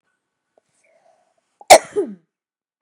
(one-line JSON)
{"cough_length": "2.8 s", "cough_amplitude": 32768, "cough_signal_mean_std_ratio": 0.18, "survey_phase": "beta (2021-08-13 to 2022-03-07)", "age": "45-64", "gender": "Female", "wearing_mask": "No", "symptom_none": true, "smoker_status": "Never smoked", "respiratory_condition_asthma": false, "respiratory_condition_other": false, "recruitment_source": "REACT", "submission_delay": "2 days", "covid_test_result": "Negative", "covid_test_method": "RT-qPCR", "influenza_a_test_result": "Negative", "influenza_b_test_result": "Negative"}